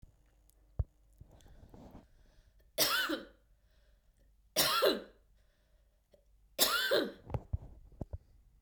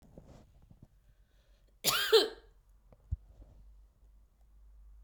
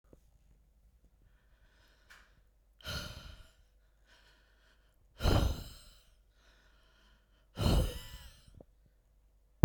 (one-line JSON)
{"three_cough_length": "8.6 s", "three_cough_amplitude": 11333, "three_cough_signal_mean_std_ratio": 0.38, "cough_length": "5.0 s", "cough_amplitude": 8433, "cough_signal_mean_std_ratio": 0.27, "exhalation_length": "9.6 s", "exhalation_amplitude": 14167, "exhalation_signal_mean_std_ratio": 0.25, "survey_phase": "beta (2021-08-13 to 2022-03-07)", "age": "45-64", "gender": "Female", "wearing_mask": "No", "symptom_fatigue": true, "symptom_headache": true, "symptom_change_to_sense_of_smell_or_taste": true, "symptom_onset": "6 days", "smoker_status": "Never smoked", "respiratory_condition_asthma": false, "respiratory_condition_other": false, "recruitment_source": "Test and Trace", "submission_delay": "1 day", "covid_test_result": "Positive", "covid_test_method": "RT-qPCR"}